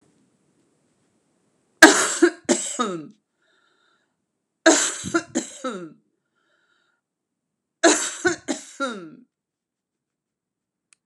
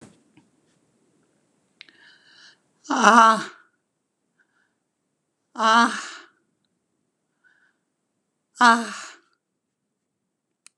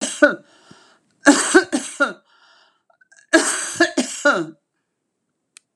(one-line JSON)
{"three_cough_length": "11.1 s", "three_cough_amplitude": 32768, "three_cough_signal_mean_std_ratio": 0.28, "exhalation_length": "10.8 s", "exhalation_amplitude": 32579, "exhalation_signal_mean_std_ratio": 0.24, "cough_length": "5.8 s", "cough_amplitude": 32767, "cough_signal_mean_std_ratio": 0.38, "survey_phase": "beta (2021-08-13 to 2022-03-07)", "age": "65+", "gender": "Female", "wearing_mask": "No", "symptom_fatigue": true, "smoker_status": "Ex-smoker", "respiratory_condition_asthma": false, "respiratory_condition_other": false, "recruitment_source": "REACT", "submission_delay": "1 day", "covid_test_result": "Negative", "covid_test_method": "RT-qPCR"}